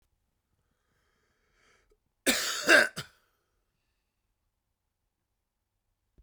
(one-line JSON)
{"cough_length": "6.2 s", "cough_amplitude": 14504, "cough_signal_mean_std_ratio": 0.21, "survey_phase": "beta (2021-08-13 to 2022-03-07)", "age": "65+", "gender": "Male", "wearing_mask": "No", "symptom_cough_any": true, "symptom_runny_or_blocked_nose": true, "symptom_shortness_of_breath": true, "symptom_fatigue": true, "smoker_status": "Current smoker (1 to 10 cigarettes per day)", "respiratory_condition_asthma": false, "respiratory_condition_other": false, "recruitment_source": "Test and Trace", "submission_delay": "2 days", "covid_test_result": "Positive", "covid_test_method": "LFT"}